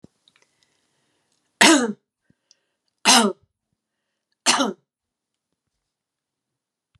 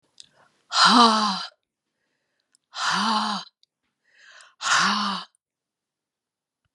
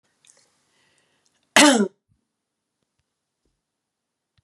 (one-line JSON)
{"three_cough_length": "7.0 s", "three_cough_amplitude": 32767, "three_cough_signal_mean_std_ratio": 0.25, "exhalation_length": "6.7 s", "exhalation_amplitude": 24152, "exhalation_signal_mean_std_ratio": 0.41, "cough_length": "4.4 s", "cough_amplitude": 32581, "cough_signal_mean_std_ratio": 0.2, "survey_phase": "beta (2021-08-13 to 2022-03-07)", "age": "65+", "gender": "Female", "wearing_mask": "No", "symptom_none": true, "smoker_status": "Ex-smoker", "respiratory_condition_asthma": false, "respiratory_condition_other": false, "recruitment_source": "REACT", "submission_delay": "0 days", "covid_test_result": "Negative", "covid_test_method": "RT-qPCR"}